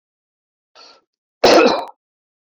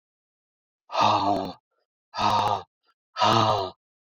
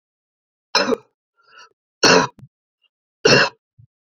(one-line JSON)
{"cough_length": "2.6 s", "cough_amplitude": 28629, "cough_signal_mean_std_ratio": 0.31, "exhalation_length": "4.2 s", "exhalation_amplitude": 17810, "exhalation_signal_mean_std_ratio": 0.51, "three_cough_length": "4.2 s", "three_cough_amplitude": 32745, "three_cough_signal_mean_std_ratio": 0.31, "survey_phase": "beta (2021-08-13 to 2022-03-07)", "age": "45-64", "gender": "Male", "wearing_mask": "No", "symptom_cough_any": true, "smoker_status": "Never smoked", "respiratory_condition_asthma": false, "respiratory_condition_other": false, "recruitment_source": "REACT", "submission_delay": "1 day", "covid_test_result": "Negative", "covid_test_method": "RT-qPCR"}